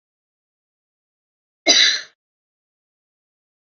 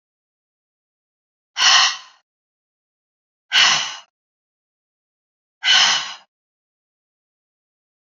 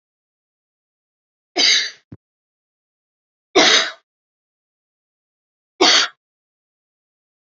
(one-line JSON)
{"cough_length": "3.8 s", "cough_amplitude": 29180, "cough_signal_mean_std_ratio": 0.23, "exhalation_length": "8.0 s", "exhalation_amplitude": 31427, "exhalation_signal_mean_std_ratio": 0.3, "three_cough_length": "7.6 s", "three_cough_amplitude": 30328, "three_cough_signal_mean_std_ratio": 0.27, "survey_phase": "beta (2021-08-13 to 2022-03-07)", "age": "45-64", "gender": "Female", "wearing_mask": "No", "symptom_none": true, "smoker_status": "Ex-smoker", "respiratory_condition_asthma": false, "respiratory_condition_other": false, "recruitment_source": "REACT", "submission_delay": "1 day", "covid_test_result": "Negative", "covid_test_method": "RT-qPCR", "influenza_a_test_result": "Negative", "influenza_b_test_result": "Negative"}